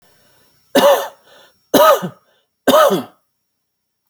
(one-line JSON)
{"three_cough_length": "4.1 s", "three_cough_amplitude": 32632, "three_cough_signal_mean_std_ratio": 0.4, "survey_phase": "alpha (2021-03-01 to 2021-08-12)", "age": "18-44", "gender": "Male", "wearing_mask": "No", "symptom_none": true, "smoker_status": "Never smoked", "respiratory_condition_asthma": false, "respiratory_condition_other": false, "recruitment_source": "REACT", "submission_delay": "2 days", "covid_test_result": "Negative", "covid_test_method": "RT-qPCR"}